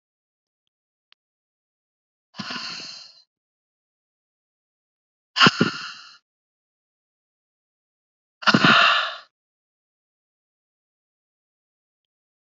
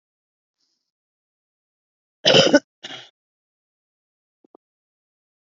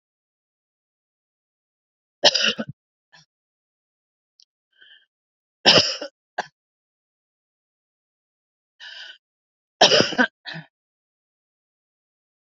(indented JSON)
{
  "exhalation_length": "12.5 s",
  "exhalation_amplitude": 27251,
  "exhalation_signal_mean_std_ratio": 0.22,
  "cough_length": "5.5 s",
  "cough_amplitude": 31206,
  "cough_signal_mean_std_ratio": 0.19,
  "three_cough_length": "12.5 s",
  "three_cough_amplitude": 32378,
  "three_cough_signal_mean_std_ratio": 0.21,
  "survey_phase": "beta (2021-08-13 to 2022-03-07)",
  "age": "45-64",
  "gender": "Female",
  "wearing_mask": "No",
  "symptom_cough_any": true,
  "symptom_shortness_of_breath": true,
  "symptom_headache": true,
  "symptom_change_to_sense_of_smell_or_taste": true,
  "symptom_onset": "3 days",
  "smoker_status": "Current smoker (11 or more cigarettes per day)",
  "respiratory_condition_asthma": false,
  "respiratory_condition_other": false,
  "recruitment_source": "Test and Trace",
  "submission_delay": "2 days",
  "covid_test_result": "Positive",
  "covid_test_method": "RT-qPCR",
  "covid_ct_value": 23.6,
  "covid_ct_gene": "N gene"
}